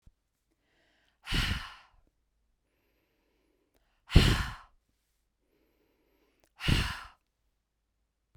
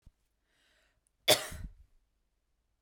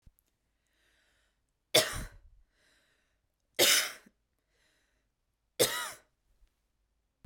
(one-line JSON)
{"exhalation_length": "8.4 s", "exhalation_amplitude": 17280, "exhalation_signal_mean_std_ratio": 0.24, "cough_length": "2.8 s", "cough_amplitude": 11373, "cough_signal_mean_std_ratio": 0.2, "three_cough_length": "7.3 s", "three_cough_amplitude": 14798, "three_cough_signal_mean_std_ratio": 0.25, "survey_phase": "beta (2021-08-13 to 2022-03-07)", "age": "18-44", "gender": "Female", "wearing_mask": "No", "symptom_runny_or_blocked_nose": true, "symptom_shortness_of_breath": true, "symptom_sore_throat": true, "symptom_fatigue": true, "symptom_fever_high_temperature": true, "symptom_headache": true, "symptom_onset": "5 days", "smoker_status": "Never smoked", "respiratory_condition_asthma": false, "respiratory_condition_other": false, "recruitment_source": "Test and Trace", "submission_delay": "1 day", "covid_test_result": "Positive", "covid_test_method": "RT-qPCR", "covid_ct_value": 18.5, "covid_ct_gene": "ORF1ab gene", "covid_ct_mean": 18.5, "covid_viral_load": "830000 copies/ml", "covid_viral_load_category": "Low viral load (10K-1M copies/ml)"}